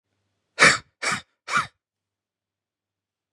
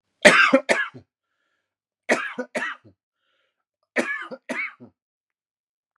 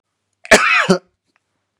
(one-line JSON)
{"exhalation_length": "3.3 s", "exhalation_amplitude": 29104, "exhalation_signal_mean_std_ratio": 0.26, "three_cough_length": "6.0 s", "three_cough_amplitude": 32768, "three_cough_signal_mean_std_ratio": 0.31, "cough_length": "1.8 s", "cough_amplitude": 32768, "cough_signal_mean_std_ratio": 0.38, "survey_phase": "beta (2021-08-13 to 2022-03-07)", "age": "18-44", "gender": "Male", "wearing_mask": "No", "symptom_none": true, "symptom_onset": "9 days", "smoker_status": "Never smoked", "respiratory_condition_asthma": false, "respiratory_condition_other": false, "recruitment_source": "REACT", "submission_delay": "2 days", "covid_test_result": "Negative", "covid_test_method": "RT-qPCR", "influenza_a_test_result": "Negative", "influenza_b_test_result": "Negative"}